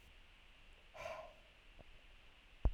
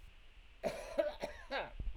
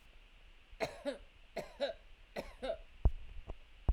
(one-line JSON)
{"exhalation_length": "2.7 s", "exhalation_amplitude": 2804, "exhalation_signal_mean_std_ratio": 0.33, "cough_length": "2.0 s", "cough_amplitude": 2831, "cough_signal_mean_std_ratio": 0.65, "three_cough_length": "3.9 s", "three_cough_amplitude": 4601, "three_cough_signal_mean_std_ratio": 0.4, "survey_phase": "alpha (2021-03-01 to 2021-08-12)", "age": "45-64", "gender": "Male", "wearing_mask": "No", "symptom_none": true, "smoker_status": "Ex-smoker", "respiratory_condition_asthma": false, "respiratory_condition_other": false, "recruitment_source": "REACT", "submission_delay": "1 day", "covid_test_result": "Negative", "covid_test_method": "RT-qPCR"}